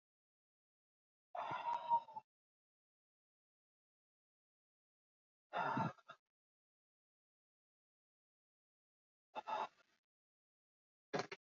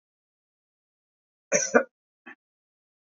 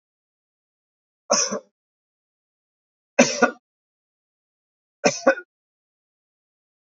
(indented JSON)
{
  "exhalation_length": "11.5 s",
  "exhalation_amplitude": 2208,
  "exhalation_signal_mean_std_ratio": 0.27,
  "cough_length": "3.1 s",
  "cough_amplitude": 20268,
  "cough_signal_mean_std_ratio": 0.2,
  "three_cough_length": "7.0 s",
  "three_cough_amplitude": 27739,
  "three_cough_signal_mean_std_ratio": 0.22,
  "survey_phase": "alpha (2021-03-01 to 2021-08-12)",
  "age": "65+",
  "gender": "Male",
  "wearing_mask": "No",
  "symptom_none": true,
  "smoker_status": "Never smoked",
  "respiratory_condition_asthma": false,
  "respiratory_condition_other": false,
  "recruitment_source": "REACT",
  "submission_delay": "2 days",
  "covid_test_result": "Negative",
  "covid_test_method": "RT-qPCR"
}